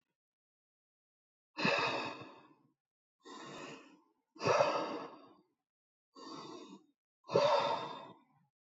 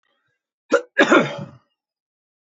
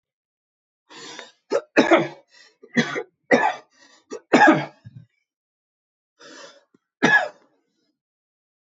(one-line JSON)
{"exhalation_length": "8.6 s", "exhalation_amplitude": 5791, "exhalation_signal_mean_std_ratio": 0.4, "cough_length": "2.5 s", "cough_amplitude": 25858, "cough_signal_mean_std_ratio": 0.32, "three_cough_length": "8.6 s", "three_cough_amplitude": 25799, "three_cough_signal_mean_std_ratio": 0.31, "survey_phase": "beta (2021-08-13 to 2022-03-07)", "age": "65+", "gender": "Male", "wearing_mask": "No", "symptom_none": true, "smoker_status": "Never smoked", "respiratory_condition_asthma": true, "respiratory_condition_other": false, "recruitment_source": "REACT", "submission_delay": "1 day", "covid_test_result": "Negative", "covid_test_method": "RT-qPCR", "influenza_a_test_result": "Negative", "influenza_b_test_result": "Negative"}